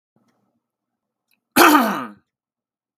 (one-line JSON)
{"cough_length": "3.0 s", "cough_amplitude": 32768, "cough_signal_mean_std_ratio": 0.29, "survey_phase": "beta (2021-08-13 to 2022-03-07)", "age": "18-44", "gender": "Male", "wearing_mask": "No", "symptom_none": true, "smoker_status": "Never smoked", "respiratory_condition_asthma": false, "respiratory_condition_other": false, "recruitment_source": "REACT", "submission_delay": "1 day", "covid_test_result": "Negative", "covid_test_method": "RT-qPCR"}